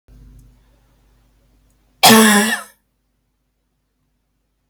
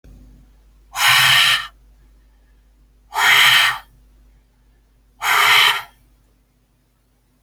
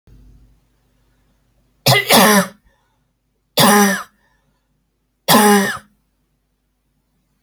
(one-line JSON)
{"cough_length": "4.7 s", "cough_amplitude": 32768, "cough_signal_mean_std_ratio": 0.28, "exhalation_length": "7.4 s", "exhalation_amplitude": 29671, "exhalation_signal_mean_std_ratio": 0.43, "three_cough_length": "7.4 s", "three_cough_amplitude": 32768, "three_cough_signal_mean_std_ratio": 0.37, "survey_phase": "beta (2021-08-13 to 2022-03-07)", "age": "18-44", "gender": "Female", "wearing_mask": "No", "symptom_cough_any": true, "symptom_runny_or_blocked_nose": true, "symptom_shortness_of_breath": true, "symptom_fatigue": true, "smoker_status": "Never smoked", "respiratory_condition_asthma": false, "respiratory_condition_other": false, "recruitment_source": "Test and Trace", "submission_delay": "2 days", "covid_test_result": "Positive", "covid_test_method": "RT-qPCR", "covid_ct_value": 15.6, "covid_ct_gene": "ORF1ab gene", "covid_ct_mean": 16.0, "covid_viral_load": "5500000 copies/ml", "covid_viral_load_category": "High viral load (>1M copies/ml)"}